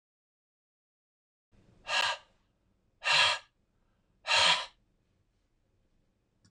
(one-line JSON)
{"exhalation_length": "6.5 s", "exhalation_amplitude": 8644, "exhalation_signal_mean_std_ratio": 0.31, "survey_phase": "alpha (2021-03-01 to 2021-08-12)", "age": "65+", "gender": "Male", "wearing_mask": "No", "symptom_none": true, "smoker_status": "Never smoked", "respiratory_condition_asthma": false, "respiratory_condition_other": false, "recruitment_source": "REACT", "submission_delay": "1 day", "covid_test_result": "Negative", "covid_test_method": "RT-qPCR"}